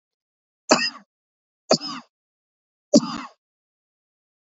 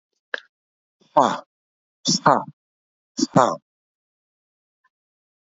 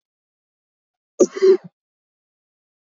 {
  "three_cough_length": "4.5 s",
  "three_cough_amplitude": 30304,
  "three_cough_signal_mean_std_ratio": 0.23,
  "exhalation_length": "5.5 s",
  "exhalation_amplitude": 30752,
  "exhalation_signal_mean_std_ratio": 0.25,
  "cough_length": "2.8 s",
  "cough_amplitude": 28349,
  "cough_signal_mean_std_ratio": 0.24,
  "survey_phase": "beta (2021-08-13 to 2022-03-07)",
  "age": "45-64",
  "gender": "Male",
  "wearing_mask": "No",
  "symptom_cough_any": true,
  "symptom_sore_throat": true,
  "smoker_status": "Never smoked",
  "respiratory_condition_asthma": false,
  "respiratory_condition_other": false,
  "recruitment_source": "REACT",
  "submission_delay": "1 day",
  "covid_test_result": "Negative",
  "covid_test_method": "RT-qPCR"
}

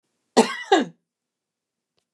{
  "cough_length": "2.1 s",
  "cough_amplitude": 26924,
  "cough_signal_mean_std_ratio": 0.27,
  "survey_phase": "beta (2021-08-13 to 2022-03-07)",
  "age": "65+",
  "gender": "Female",
  "wearing_mask": "No",
  "symptom_none": true,
  "smoker_status": "Never smoked",
  "respiratory_condition_asthma": false,
  "respiratory_condition_other": false,
  "recruitment_source": "REACT",
  "submission_delay": "1 day",
  "covid_test_result": "Negative",
  "covid_test_method": "RT-qPCR",
  "influenza_a_test_result": "Negative",
  "influenza_b_test_result": "Negative"
}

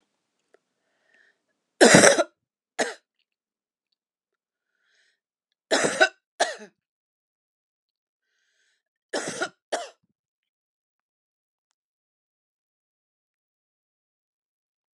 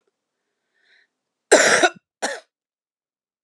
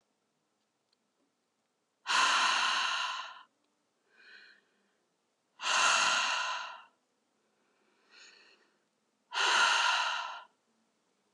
{
  "three_cough_length": "15.0 s",
  "three_cough_amplitude": 32767,
  "three_cough_signal_mean_std_ratio": 0.19,
  "cough_length": "3.4 s",
  "cough_amplitude": 32021,
  "cough_signal_mean_std_ratio": 0.28,
  "exhalation_length": "11.3 s",
  "exhalation_amplitude": 6541,
  "exhalation_signal_mean_std_ratio": 0.45,
  "survey_phase": "beta (2021-08-13 to 2022-03-07)",
  "age": "45-64",
  "gender": "Female",
  "wearing_mask": "No",
  "symptom_runny_or_blocked_nose": true,
  "symptom_abdominal_pain": true,
  "symptom_fatigue": true,
  "symptom_fever_high_temperature": true,
  "symptom_headache": true,
  "symptom_other": true,
  "smoker_status": "Current smoker (1 to 10 cigarettes per day)",
  "respiratory_condition_asthma": false,
  "respiratory_condition_other": false,
  "recruitment_source": "Test and Trace",
  "submission_delay": "2 days",
  "covid_test_result": "Positive",
  "covid_test_method": "RT-qPCR",
  "covid_ct_value": 34.1,
  "covid_ct_gene": "ORF1ab gene"
}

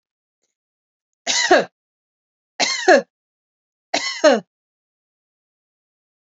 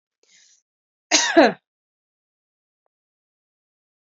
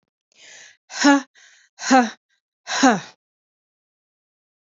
{
  "three_cough_length": "6.4 s",
  "three_cough_amplitude": 28425,
  "three_cough_signal_mean_std_ratio": 0.29,
  "cough_length": "4.0 s",
  "cough_amplitude": 27742,
  "cough_signal_mean_std_ratio": 0.22,
  "exhalation_length": "4.8 s",
  "exhalation_amplitude": 28109,
  "exhalation_signal_mean_std_ratio": 0.3,
  "survey_phase": "alpha (2021-03-01 to 2021-08-12)",
  "age": "45-64",
  "gender": "Female",
  "wearing_mask": "No",
  "symptom_none": true,
  "smoker_status": "Ex-smoker",
  "respiratory_condition_asthma": false,
  "respiratory_condition_other": false,
  "recruitment_source": "REACT",
  "submission_delay": "1 day",
  "covid_test_result": "Negative",
  "covid_test_method": "RT-qPCR"
}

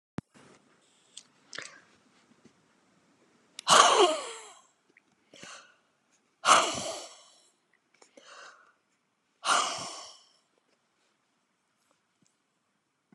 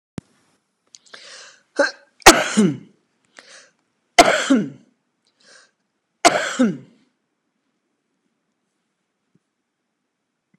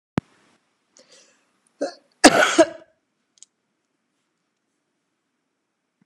{
  "exhalation_length": "13.1 s",
  "exhalation_amplitude": 22899,
  "exhalation_signal_mean_std_ratio": 0.25,
  "three_cough_length": "10.6 s",
  "three_cough_amplitude": 32768,
  "three_cough_signal_mean_std_ratio": 0.25,
  "cough_length": "6.1 s",
  "cough_amplitude": 32768,
  "cough_signal_mean_std_ratio": 0.2,
  "survey_phase": "beta (2021-08-13 to 2022-03-07)",
  "age": "65+",
  "gender": "Female",
  "wearing_mask": "No",
  "symptom_none": true,
  "smoker_status": "Never smoked",
  "respiratory_condition_asthma": false,
  "respiratory_condition_other": false,
  "recruitment_source": "REACT",
  "submission_delay": "3 days",
  "covid_test_result": "Negative",
  "covid_test_method": "RT-qPCR"
}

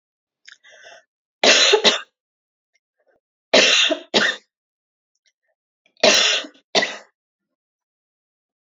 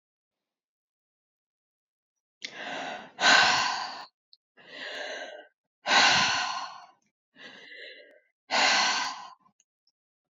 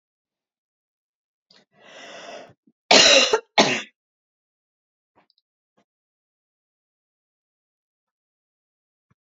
{
  "three_cough_length": "8.6 s",
  "three_cough_amplitude": 31779,
  "three_cough_signal_mean_std_ratio": 0.35,
  "exhalation_length": "10.3 s",
  "exhalation_amplitude": 13667,
  "exhalation_signal_mean_std_ratio": 0.4,
  "cough_length": "9.2 s",
  "cough_amplitude": 32647,
  "cough_signal_mean_std_ratio": 0.21,
  "survey_phase": "alpha (2021-03-01 to 2021-08-12)",
  "age": "65+",
  "gender": "Female",
  "wearing_mask": "No",
  "symptom_none": true,
  "smoker_status": "Never smoked",
  "respiratory_condition_asthma": false,
  "respiratory_condition_other": false,
  "recruitment_source": "REACT",
  "submission_delay": "2 days",
  "covid_test_result": "Negative",
  "covid_test_method": "RT-qPCR"
}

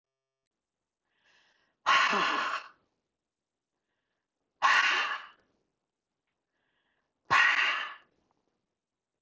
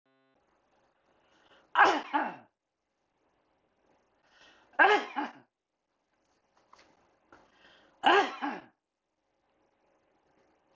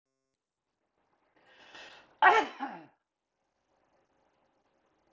{
  "exhalation_length": "9.2 s",
  "exhalation_amplitude": 9171,
  "exhalation_signal_mean_std_ratio": 0.36,
  "three_cough_length": "10.8 s",
  "three_cough_amplitude": 10639,
  "three_cough_signal_mean_std_ratio": 0.25,
  "cough_length": "5.1 s",
  "cough_amplitude": 16406,
  "cough_signal_mean_std_ratio": 0.2,
  "survey_phase": "beta (2021-08-13 to 2022-03-07)",
  "age": "65+",
  "gender": "Male",
  "wearing_mask": "No",
  "symptom_none": true,
  "smoker_status": "Never smoked",
  "respiratory_condition_asthma": false,
  "respiratory_condition_other": false,
  "recruitment_source": "REACT",
  "submission_delay": "1 day",
  "covid_test_result": "Negative",
  "covid_test_method": "RT-qPCR"
}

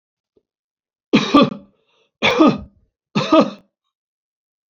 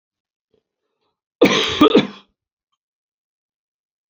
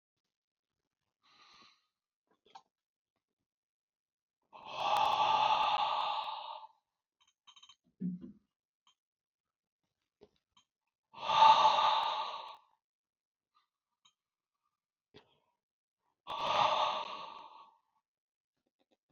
{
  "three_cough_length": "4.7 s",
  "three_cough_amplitude": 28514,
  "three_cough_signal_mean_std_ratio": 0.35,
  "cough_length": "4.1 s",
  "cough_amplitude": 28719,
  "cough_signal_mean_std_ratio": 0.28,
  "exhalation_length": "19.1 s",
  "exhalation_amplitude": 7818,
  "exhalation_signal_mean_std_ratio": 0.34,
  "survey_phase": "alpha (2021-03-01 to 2021-08-12)",
  "age": "65+",
  "gender": "Male",
  "wearing_mask": "No",
  "symptom_none": true,
  "symptom_onset": "12 days",
  "smoker_status": "Never smoked",
  "respiratory_condition_asthma": false,
  "respiratory_condition_other": false,
  "recruitment_source": "REACT",
  "submission_delay": "1 day",
  "covid_test_method": "RT-qPCR"
}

